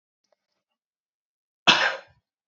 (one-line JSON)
{"cough_length": "2.5 s", "cough_amplitude": 28110, "cough_signal_mean_std_ratio": 0.24, "survey_phase": "beta (2021-08-13 to 2022-03-07)", "age": "18-44", "gender": "Male", "wearing_mask": "No", "symptom_runny_or_blocked_nose": true, "symptom_onset": "2 days", "smoker_status": "Never smoked", "respiratory_condition_asthma": false, "respiratory_condition_other": false, "recruitment_source": "REACT", "submission_delay": "4 days", "covid_test_result": "Positive", "covid_test_method": "RT-qPCR", "covid_ct_value": 28.5, "covid_ct_gene": "E gene", "influenza_a_test_result": "Negative", "influenza_b_test_result": "Negative"}